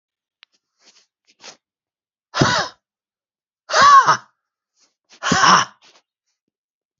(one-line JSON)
{"exhalation_length": "7.0 s", "exhalation_amplitude": 31921, "exhalation_signal_mean_std_ratio": 0.31, "survey_phase": "beta (2021-08-13 to 2022-03-07)", "age": "45-64", "gender": "Male", "wearing_mask": "No", "symptom_runny_or_blocked_nose": true, "symptom_sore_throat": true, "symptom_fatigue": true, "symptom_headache": true, "smoker_status": "Never smoked", "respiratory_condition_asthma": false, "respiratory_condition_other": false, "recruitment_source": "Test and Trace", "submission_delay": "2 days", "covid_test_result": "Positive", "covid_test_method": "LFT"}